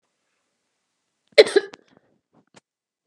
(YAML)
cough_length: 3.1 s
cough_amplitude: 32768
cough_signal_mean_std_ratio: 0.15
survey_phase: beta (2021-08-13 to 2022-03-07)
age: 45-64
gender: Female
wearing_mask: 'No'
symptom_none: true
smoker_status: Ex-smoker
respiratory_condition_asthma: false
respiratory_condition_other: false
recruitment_source: REACT
submission_delay: 2 days
covid_test_result: Negative
covid_test_method: RT-qPCR
influenza_a_test_result: Negative
influenza_b_test_result: Negative